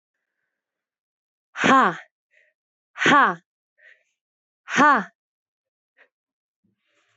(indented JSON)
{
  "exhalation_length": "7.2 s",
  "exhalation_amplitude": 21731,
  "exhalation_signal_mean_std_ratio": 0.28,
  "survey_phase": "beta (2021-08-13 to 2022-03-07)",
  "age": "18-44",
  "gender": "Female",
  "wearing_mask": "No",
  "symptom_cough_any": true,
  "symptom_new_continuous_cough": true,
  "symptom_runny_or_blocked_nose": true,
  "symptom_sore_throat": true,
  "symptom_headache": true,
  "symptom_onset": "4 days",
  "smoker_status": "Never smoked",
  "respiratory_condition_asthma": false,
  "respiratory_condition_other": false,
  "recruitment_source": "Test and Trace",
  "submission_delay": "1 day",
  "covid_test_result": "Negative",
  "covid_test_method": "RT-qPCR"
}